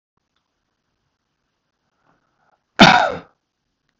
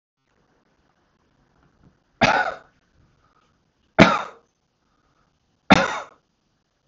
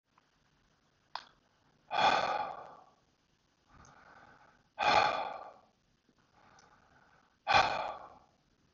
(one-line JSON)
{"cough_length": "4.0 s", "cough_amplitude": 32768, "cough_signal_mean_std_ratio": 0.2, "three_cough_length": "6.9 s", "three_cough_amplitude": 32768, "three_cough_signal_mean_std_ratio": 0.22, "exhalation_length": "8.7 s", "exhalation_amplitude": 7433, "exhalation_signal_mean_std_ratio": 0.34, "survey_phase": "beta (2021-08-13 to 2022-03-07)", "age": "65+", "gender": "Male", "wearing_mask": "No", "symptom_none": true, "smoker_status": "Ex-smoker", "respiratory_condition_asthma": false, "respiratory_condition_other": false, "recruitment_source": "REACT", "submission_delay": "2 days", "covid_test_result": "Negative", "covid_test_method": "RT-qPCR", "influenza_a_test_result": "Negative", "influenza_b_test_result": "Negative"}